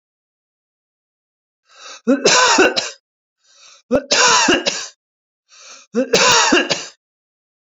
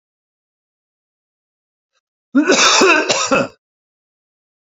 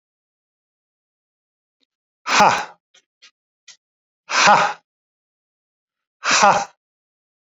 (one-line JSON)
{"three_cough_length": "7.8 s", "three_cough_amplitude": 32767, "three_cough_signal_mean_std_ratio": 0.45, "cough_length": "4.8 s", "cough_amplitude": 32768, "cough_signal_mean_std_ratio": 0.39, "exhalation_length": "7.6 s", "exhalation_amplitude": 28846, "exhalation_signal_mean_std_ratio": 0.3, "survey_phase": "beta (2021-08-13 to 2022-03-07)", "age": "65+", "gender": "Male", "wearing_mask": "No", "symptom_none": true, "smoker_status": "Ex-smoker", "respiratory_condition_asthma": false, "respiratory_condition_other": false, "recruitment_source": "REACT", "submission_delay": "1 day", "covid_test_result": "Negative", "covid_test_method": "RT-qPCR"}